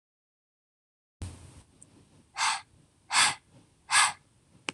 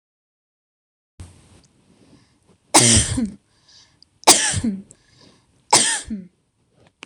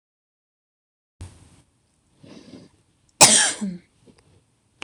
{
  "exhalation_length": "4.7 s",
  "exhalation_amplitude": 11823,
  "exhalation_signal_mean_std_ratio": 0.31,
  "three_cough_length": "7.1 s",
  "three_cough_amplitude": 26028,
  "three_cough_signal_mean_std_ratio": 0.32,
  "cough_length": "4.8 s",
  "cough_amplitude": 26028,
  "cough_signal_mean_std_ratio": 0.22,
  "survey_phase": "beta (2021-08-13 to 2022-03-07)",
  "age": "18-44",
  "gender": "Female",
  "wearing_mask": "No",
  "symptom_none": true,
  "smoker_status": "Never smoked",
  "respiratory_condition_asthma": true,
  "respiratory_condition_other": false,
  "recruitment_source": "REACT",
  "submission_delay": "1 day",
  "covid_test_result": "Negative",
  "covid_test_method": "RT-qPCR"
}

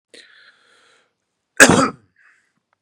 {
  "three_cough_length": "2.8 s",
  "three_cough_amplitude": 32768,
  "three_cough_signal_mean_std_ratio": 0.24,
  "survey_phase": "beta (2021-08-13 to 2022-03-07)",
  "age": "45-64",
  "gender": "Male",
  "wearing_mask": "No",
  "symptom_none": true,
  "symptom_onset": "8 days",
  "smoker_status": "Ex-smoker",
  "respiratory_condition_asthma": false,
  "respiratory_condition_other": false,
  "recruitment_source": "REACT",
  "submission_delay": "1 day",
  "covid_test_result": "Negative",
  "covid_test_method": "RT-qPCR",
  "influenza_a_test_result": "Negative",
  "influenza_b_test_result": "Negative"
}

